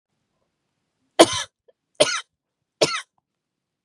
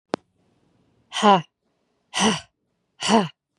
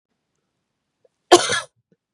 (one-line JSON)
{"three_cough_length": "3.8 s", "three_cough_amplitude": 32768, "three_cough_signal_mean_std_ratio": 0.23, "exhalation_length": "3.6 s", "exhalation_amplitude": 26555, "exhalation_signal_mean_std_ratio": 0.33, "cough_length": "2.1 s", "cough_amplitude": 32768, "cough_signal_mean_std_ratio": 0.22, "survey_phase": "beta (2021-08-13 to 2022-03-07)", "age": "45-64", "gender": "Female", "wearing_mask": "No", "symptom_fatigue": true, "symptom_onset": "12 days", "smoker_status": "Never smoked", "respiratory_condition_asthma": false, "respiratory_condition_other": false, "recruitment_source": "REACT", "submission_delay": "4 days", "covid_test_result": "Negative", "covid_test_method": "RT-qPCR", "influenza_a_test_result": "Negative", "influenza_b_test_result": "Negative"}